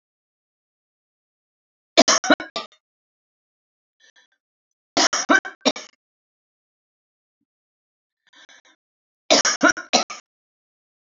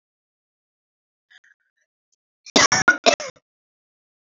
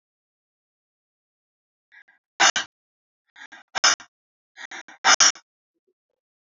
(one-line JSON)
{"three_cough_length": "11.2 s", "three_cough_amplitude": 32768, "three_cough_signal_mean_std_ratio": 0.24, "cough_length": "4.4 s", "cough_amplitude": 32767, "cough_signal_mean_std_ratio": 0.23, "exhalation_length": "6.6 s", "exhalation_amplitude": 25093, "exhalation_signal_mean_std_ratio": 0.22, "survey_phase": "beta (2021-08-13 to 2022-03-07)", "age": "65+", "gender": "Female", "wearing_mask": "No", "symptom_none": true, "smoker_status": "Never smoked", "respiratory_condition_asthma": false, "respiratory_condition_other": false, "recruitment_source": "REACT", "submission_delay": "5 days", "covid_test_result": "Negative", "covid_test_method": "RT-qPCR"}